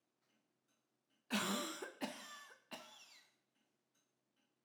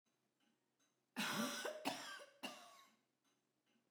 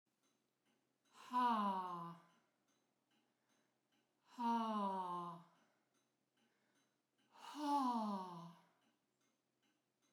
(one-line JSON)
{"three_cough_length": "4.6 s", "three_cough_amplitude": 1702, "three_cough_signal_mean_std_ratio": 0.37, "cough_length": "3.9 s", "cough_amplitude": 1763, "cough_signal_mean_std_ratio": 0.45, "exhalation_length": "10.1 s", "exhalation_amplitude": 1195, "exhalation_signal_mean_std_ratio": 0.43, "survey_phase": "alpha (2021-03-01 to 2021-08-12)", "age": "65+", "gender": "Female", "wearing_mask": "No", "symptom_none": true, "smoker_status": "Never smoked", "respiratory_condition_asthma": true, "respiratory_condition_other": false, "recruitment_source": "REACT", "submission_delay": "2 days", "covid_test_result": "Negative", "covid_test_method": "RT-qPCR"}